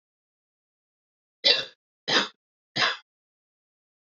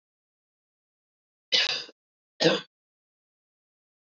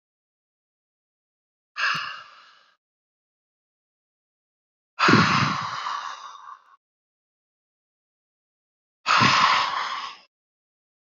three_cough_length: 4.0 s
three_cough_amplitude: 19986
three_cough_signal_mean_std_ratio: 0.28
cough_length: 4.2 s
cough_amplitude: 13296
cough_signal_mean_std_ratio: 0.25
exhalation_length: 11.0 s
exhalation_amplitude: 25038
exhalation_signal_mean_std_ratio: 0.35
survey_phase: beta (2021-08-13 to 2022-03-07)
age: 45-64
gender: Female
wearing_mask: 'No'
symptom_headache: true
smoker_status: Never smoked
respiratory_condition_asthma: true
respiratory_condition_other: false
recruitment_source: REACT
submission_delay: 1 day
covid_test_result: Negative
covid_test_method: RT-qPCR
influenza_a_test_result: Negative
influenza_b_test_result: Negative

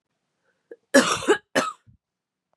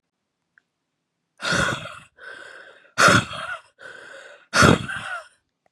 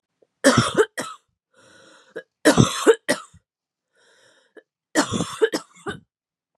cough_length: 2.6 s
cough_amplitude: 28297
cough_signal_mean_std_ratio: 0.32
exhalation_length: 5.7 s
exhalation_amplitude: 28805
exhalation_signal_mean_std_ratio: 0.36
three_cough_length: 6.6 s
three_cough_amplitude: 31974
three_cough_signal_mean_std_ratio: 0.33
survey_phase: beta (2021-08-13 to 2022-03-07)
age: 18-44
gender: Female
wearing_mask: 'No'
symptom_cough_any: true
symptom_runny_or_blocked_nose: true
symptom_shortness_of_breath: true
symptom_sore_throat: true
symptom_abdominal_pain: true
symptom_fever_high_temperature: true
symptom_headache: true
symptom_onset: 2 days
smoker_status: Current smoker (e-cigarettes or vapes only)
respiratory_condition_asthma: true
respiratory_condition_other: false
recruitment_source: Test and Trace
submission_delay: 1 day
covid_test_result: Positive
covid_test_method: RT-qPCR
covid_ct_value: 19.4
covid_ct_gene: N gene
covid_ct_mean: 20.0
covid_viral_load: 280000 copies/ml
covid_viral_load_category: Low viral load (10K-1M copies/ml)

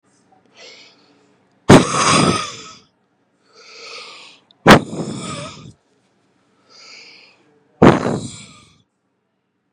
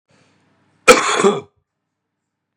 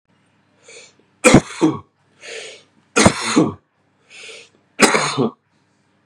exhalation_length: 9.7 s
exhalation_amplitude: 32768
exhalation_signal_mean_std_ratio: 0.29
cough_length: 2.6 s
cough_amplitude: 32768
cough_signal_mean_std_ratio: 0.31
three_cough_length: 6.1 s
three_cough_amplitude: 32768
three_cough_signal_mean_std_ratio: 0.35
survey_phase: beta (2021-08-13 to 2022-03-07)
age: 18-44
gender: Male
wearing_mask: 'No'
symptom_cough_any: true
symptom_runny_or_blocked_nose: true
symptom_onset: 12 days
smoker_status: Ex-smoker
respiratory_condition_asthma: false
respiratory_condition_other: false
recruitment_source: REACT
submission_delay: 1 day
covid_test_result: Negative
covid_test_method: RT-qPCR
influenza_a_test_result: Negative
influenza_b_test_result: Negative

